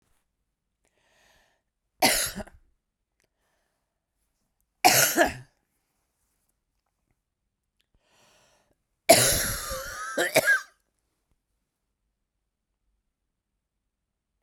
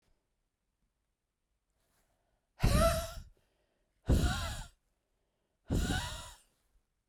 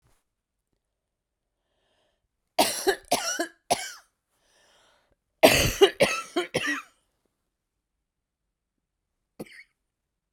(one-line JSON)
{"three_cough_length": "14.4 s", "three_cough_amplitude": 27941, "three_cough_signal_mean_std_ratio": 0.26, "exhalation_length": "7.1 s", "exhalation_amplitude": 5972, "exhalation_signal_mean_std_ratio": 0.35, "cough_length": "10.3 s", "cough_amplitude": 32767, "cough_signal_mean_std_ratio": 0.28, "survey_phase": "beta (2021-08-13 to 2022-03-07)", "age": "18-44", "gender": "Female", "wearing_mask": "No", "symptom_cough_any": true, "symptom_runny_or_blocked_nose": true, "symptom_sore_throat": true, "symptom_abdominal_pain": true, "symptom_diarrhoea": true, "symptom_fatigue": true, "symptom_fever_high_temperature": true, "symptom_headache": true, "symptom_change_to_sense_of_smell_or_taste": true, "symptom_loss_of_taste": true, "symptom_onset": "4 days", "smoker_status": "Ex-smoker", "respiratory_condition_asthma": false, "respiratory_condition_other": false, "recruitment_source": "Test and Trace", "submission_delay": "2 days", "covid_test_result": "Positive", "covid_test_method": "ePCR"}